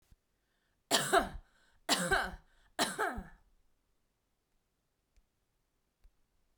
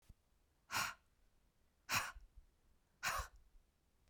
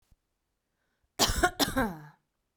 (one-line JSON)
{"three_cough_length": "6.6 s", "three_cough_amplitude": 7869, "three_cough_signal_mean_std_ratio": 0.32, "exhalation_length": "4.1 s", "exhalation_amplitude": 2393, "exhalation_signal_mean_std_ratio": 0.36, "cough_length": "2.6 s", "cough_amplitude": 13806, "cough_signal_mean_std_ratio": 0.37, "survey_phase": "beta (2021-08-13 to 2022-03-07)", "age": "18-44", "gender": "Female", "wearing_mask": "No", "symptom_none": true, "smoker_status": "Ex-smoker", "respiratory_condition_asthma": false, "respiratory_condition_other": false, "recruitment_source": "REACT", "submission_delay": "1 day", "covid_test_result": "Negative", "covid_test_method": "RT-qPCR", "influenza_a_test_result": "Negative", "influenza_b_test_result": "Negative"}